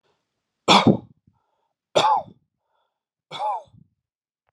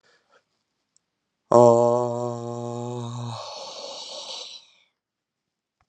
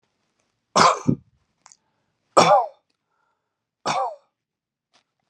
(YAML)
three_cough_length: 4.5 s
three_cough_amplitude: 28115
three_cough_signal_mean_std_ratio: 0.3
exhalation_length: 5.9 s
exhalation_amplitude: 27343
exhalation_signal_mean_std_ratio: 0.35
cough_length: 5.3 s
cough_amplitude: 32003
cough_signal_mean_std_ratio: 0.29
survey_phase: beta (2021-08-13 to 2022-03-07)
age: 45-64
gender: Male
wearing_mask: 'No'
symptom_none: true
smoker_status: Ex-smoker
respiratory_condition_asthma: false
respiratory_condition_other: false
recruitment_source: REACT
submission_delay: 3 days
covid_test_result: Negative
covid_test_method: RT-qPCR